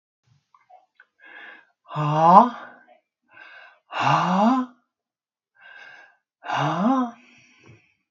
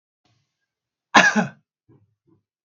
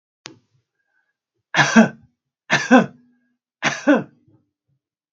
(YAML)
exhalation_length: 8.1 s
exhalation_amplitude: 32766
exhalation_signal_mean_std_ratio: 0.38
cough_length: 2.6 s
cough_amplitude: 32767
cough_signal_mean_std_ratio: 0.25
three_cough_length: 5.1 s
three_cough_amplitude: 32767
three_cough_signal_mean_std_ratio: 0.31
survey_phase: beta (2021-08-13 to 2022-03-07)
age: 65+
gender: Male
wearing_mask: 'No'
symptom_none: true
smoker_status: Ex-smoker
respiratory_condition_asthma: false
respiratory_condition_other: false
recruitment_source: REACT
submission_delay: 1 day
covid_test_result: Negative
covid_test_method: RT-qPCR
influenza_a_test_result: Negative
influenza_b_test_result: Negative